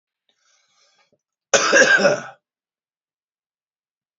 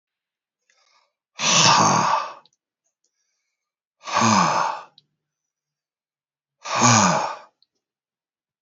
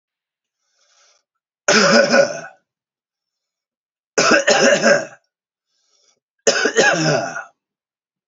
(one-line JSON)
{"cough_length": "4.2 s", "cough_amplitude": 30732, "cough_signal_mean_std_ratio": 0.31, "exhalation_length": "8.6 s", "exhalation_amplitude": 28124, "exhalation_signal_mean_std_ratio": 0.41, "three_cough_length": "8.3 s", "three_cough_amplitude": 32252, "three_cough_signal_mean_std_ratio": 0.43, "survey_phase": "alpha (2021-03-01 to 2021-08-12)", "age": "45-64", "gender": "Male", "wearing_mask": "No", "symptom_none": true, "smoker_status": "Current smoker (1 to 10 cigarettes per day)", "respiratory_condition_asthma": false, "respiratory_condition_other": false, "recruitment_source": "REACT", "submission_delay": "3 days", "covid_test_result": "Negative", "covid_test_method": "RT-qPCR"}